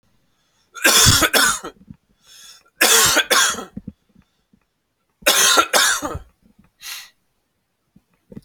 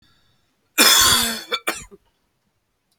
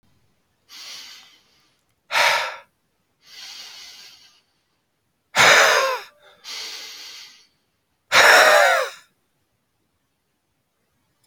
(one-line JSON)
{"three_cough_length": "8.4 s", "three_cough_amplitude": 32768, "three_cough_signal_mean_std_ratio": 0.43, "cough_length": "3.0 s", "cough_amplitude": 32768, "cough_signal_mean_std_ratio": 0.39, "exhalation_length": "11.3 s", "exhalation_amplitude": 30200, "exhalation_signal_mean_std_ratio": 0.34, "survey_phase": "beta (2021-08-13 to 2022-03-07)", "age": "18-44", "gender": "Male", "wearing_mask": "No", "symptom_runny_or_blocked_nose": true, "symptom_fatigue": true, "symptom_headache": true, "symptom_onset": "8 days", "smoker_status": "Never smoked", "respiratory_condition_asthma": false, "respiratory_condition_other": false, "recruitment_source": "Test and Trace", "submission_delay": "2 days", "covid_test_result": "Positive", "covid_test_method": "RT-qPCR"}